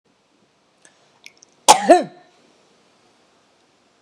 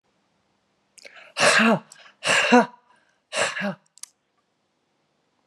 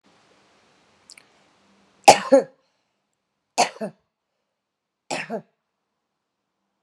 {
  "cough_length": "4.0 s",
  "cough_amplitude": 32768,
  "cough_signal_mean_std_ratio": 0.2,
  "exhalation_length": "5.5 s",
  "exhalation_amplitude": 25825,
  "exhalation_signal_mean_std_ratio": 0.36,
  "three_cough_length": "6.8 s",
  "three_cough_amplitude": 32768,
  "three_cough_signal_mean_std_ratio": 0.18,
  "survey_phase": "beta (2021-08-13 to 2022-03-07)",
  "age": "45-64",
  "gender": "Female",
  "wearing_mask": "No",
  "symptom_none": true,
  "smoker_status": "Current smoker (1 to 10 cigarettes per day)",
  "respiratory_condition_asthma": false,
  "respiratory_condition_other": false,
  "recruitment_source": "REACT",
  "submission_delay": "1 day",
  "covid_test_result": "Negative",
  "covid_test_method": "RT-qPCR"
}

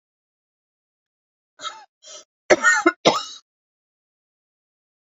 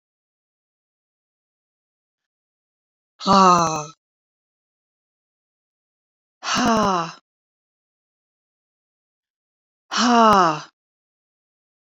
{
  "cough_length": "5.0 s",
  "cough_amplitude": 28364,
  "cough_signal_mean_std_ratio": 0.25,
  "exhalation_length": "11.9 s",
  "exhalation_amplitude": 25747,
  "exhalation_signal_mean_std_ratio": 0.28,
  "survey_phase": "beta (2021-08-13 to 2022-03-07)",
  "age": "45-64",
  "gender": "Female",
  "wearing_mask": "No",
  "symptom_none": true,
  "smoker_status": "Never smoked",
  "respiratory_condition_asthma": false,
  "respiratory_condition_other": false,
  "recruitment_source": "REACT",
  "submission_delay": "2 days",
  "covid_test_result": "Negative",
  "covid_test_method": "RT-qPCR"
}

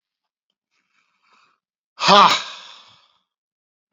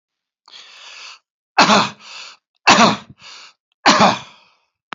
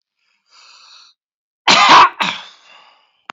{
  "exhalation_length": "3.9 s",
  "exhalation_amplitude": 29160,
  "exhalation_signal_mean_std_ratio": 0.24,
  "three_cough_length": "4.9 s",
  "three_cough_amplitude": 32767,
  "three_cough_signal_mean_std_ratio": 0.37,
  "cough_length": "3.3 s",
  "cough_amplitude": 30350,
  "cough_signal_mean_std_ratio": 0.35,
  "survey_phase": "beta (2021-08-13 to 2022-03-07)",
  "age": "65+",
  "gender": "Male",
  "wearing_mask": "No",
  "symptom_none": true,
  "smoker_status": "Never smoked",
  "respiratory_condition_asthma": false,
  "respiratory_condition_other": false,
  "recruitment_source": "REACT",
  "submission_delay": "1 day",
  "covid_test_result": "Negative",
  "covid_test_method": "RT-qPCR",
  "influenza_a_test_result": "Negative",
  "influenza_b_test_result": "Negative"
}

